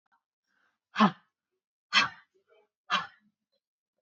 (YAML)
exhalation_length: 4.0 s
exhalation_amplitude: 11340
exhalation_signal_mean_std_ratio: 0.24
survey_phase: beta (2021-08-13 to 2022-03-07)
age: 18-44
gender: Female
wearing_mask: 'No'
symptom_cough_any: true
symptom_fatigue: true
symptom_headache: true
symptom_onset: 13 days
smoker_status: Ex-smoker
respiratory_condition_asthma: false
respiratory_condition_other: false
recruitment_source: REACT
submission_delay: 2 days
covid_test_result: Negative
covid_test_method: RT-qPCR